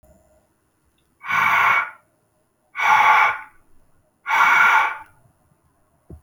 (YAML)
exhalation_length: 6.2 s
exhalation_amplitude: 23658
exhalation_signal_mean_std_ratio: 0.47
survey_phase: beta (2021-08-13 to 2022-03-07)
age: 18-44
gender: Male
wearing_mask: 'No'
symptom_none: true
smoker_status: Never smoked
respiratory_condition_asthma: false
respiratory_condition_other: false
recruitment_source: REACT
submission_delay: 3 days
covid_test_result: Negative
covid_test_method: RT-qPCR